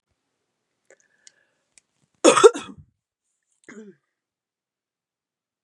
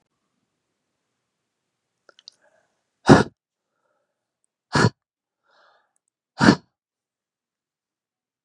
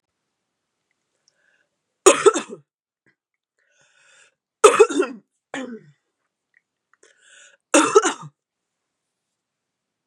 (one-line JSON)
{"cough_length": "5.6 s", "cough_amplitude": 31736, "cough_signal_mean_std_ratio": 0.16, "exhalation_length": "8.4 s", "exhalation_amplitude": 32768, "exhalation_signal_mean_std_ratio": 0.17, "three_cough_length": "10.1 s", "three_cough_amplitude": 32767, "three_cough_signal_mean_std_ratio": 0.23, "survey_phase": "beta (2021-08-13 to 2022-03-07)", "age": "18-44", "gender": "Female", "wearing_mask": "No", "symptom_cough_any": true, "symptom_runny_or_blocked_nose": true, "symptom_sore_throat": true, "symptom_fatigue": true, "symptom_headache": true, "symptom_other": true, "symptom_onset": "3 days", "smoker_status": "Ex-smoker", "respiratory_condition_asthma": false, "respiratory_condition_other": false, "recruitment_source": "Test and Trace", "submission_delay": "2 days", "covid_test_result": "Positive", "covid_test_method": "RT-qPCR", "covid_ct_value": 22.7, "covid_ct_gene": "ORF1ab gene"}